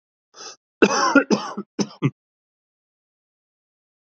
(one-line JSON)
{"cough_length": "4.2 s", "cough_amplitude": 30121, "cough_signal_mean_std_ratio": 0.3, "survey_phase": "alpha (2021-03-01 to 2021-08-12)", "age": "45-64", "gender": "Male", "wearing_mask": "No", "symptom_cough_any": true, "symptom_fatigue": true, "symptom_onset": "8 days", "smoker_status": "Ex-smoker", "respiratory_condition_asthma": false, "respiratory_condition_other": false, "recruitment_source": "REACT", "submission_delay": "1 day", "covid_test_result": "Negative", "covid_test_method": "RT-qPCR"}